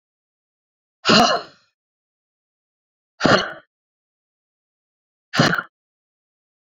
{"exhalation_length": "6.7 s", "exhalation_amplitude": 32767, "exhalation_signal_mean_std_ratio": 0.27, "survey_phase": "beta (2021-08-13 to 2022-03-07)", "age": "45-64", "gender": "Female", "wearing_mask": "No", "symptom_cough_any": true, "symptom_runny_or_blocked_nose": true, "symptom_shortness_of_breath": true, "symptom_diarrhoea": true, "symptom_fatigue": true, "symptom_fever_high_temperature": true, "symptom_change_to_sense_of_smell_or_taste": true, "symptom_loss_of_taste": true, "smoker_status": "Current smoker (1 to 10 cigarettes per day)", "respiratory_condition_asthma": false, "respiratory_condition_other": false, "recruitment_source": "Test and Trace", "submission_delay": "2 days", "covid_test_result": "Positive", "covid_test_method": "RT-qPCR", "covid_ct_value": 16.4, "covid_ct_gene": "ORF1ab gene", "covid_ct_mean": 16.8, "covid_viral_load": "3000000 copies/ml", "covid_viral_load_category": "High viral load (>1M copies/ml)"}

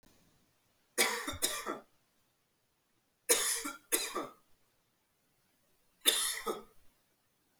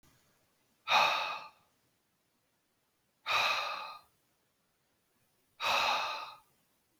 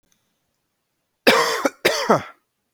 {"three_cough_length": "7.6 s", "three_cough_amplitude": 9189, "three_cough_signal_mean_std_ratio": 0.37, "exhalation_length": "7.0 s", "exhalation_amplitude": 5959, "exhalation_signal_mean_std_ratio": 0.4, "cough_length": "2.7 s", "cough_amplitude": 31901, "cough_signal_mean_std_ratio": 0.39, "survey_phase": "beta (2021-08-13 to 2022-03-07)", "age": "18-44", "gender": "Male", "wearing_mask": "No", "symptom_cough_any": true, "symptom_runny_or_blocked_nose": true, "symptom_sore_throat": true, "symptom_fatigue": true, "smoker_status": "Never smoked", "respiratory_condition_asthma": false, "respiratory_condition_other": false, "recruitment_source": "Test and Trace", "submission_delay": "2 days", "covid_test_result": "Positive", "covid_test_method": "RT-qPCR", "covid_ct_value": 25.3, "covid_ct_gene": "N gene"}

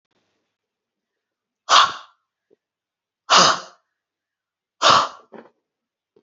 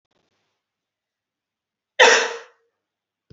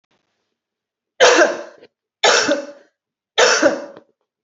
{"exhalation_length": "6.2 s", "exhalation_amplitude": 31672, "exhalation_signal_mean_std_ratio": 0.27, "cough_length": "3.3 s", "cough_amplitude": 29346, "cough_signal_mean_std_ratio": 0.23, "three_cough_length": "4.4 s", "three_cough_amplitude": 29419, "three_cough_signal_mean_std_ratio": 0.42, "survey_phase": "beta (2021-08-13 to 2022-03-07)", "age": "18-44", "gender": "Female", "wearing_mask": "No", "symptom_none": true, "smoker_status": "Never smoked", "respiratory_condition_asthma": false, "respiratory_condition_other": false, "recruitment_source": "Test and Trace", "submission_delay": "0 days", "covid_test_result": "Negative", "covid_test_method": "LFT"}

